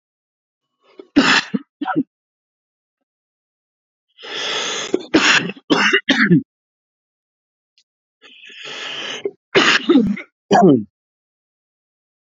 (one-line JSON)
{"three_cough_length": "12.3 s", "three_cough_amplitude": 29305, "three_cough_signal_mean_std_ratio": 0.39, "survey_phase": "alpha (2021-03-01 to 2021-08-12)", "age": "45-64", "gender": "Male", "wearing_mask": "No", "symptom_cough_any": true, "symptom_fatigue": true, "symptom_fever_high_temperature": true, "symptom_change_to_sense_of_smell_or_taste": true, "symptom_onset": "5 days", "smoker_status": "Never smoked", "respiratory_condition_asthma": false, "respiratory_condition_other": false, "recruitment_source": "Test and Trace", "submission_delay": "2 days", "covid_test_result": "Positive", "covid_test_method": "RT-qPCR", "covid_ct_value": 11.7, "covid_ct_gene": "ORF1ab gene", "covid_ct_mean": 11.9, "covid_viral_load": "120000000 copies/ml", "covid_viral_load_category": "High viral load (>1M copies/ml)"}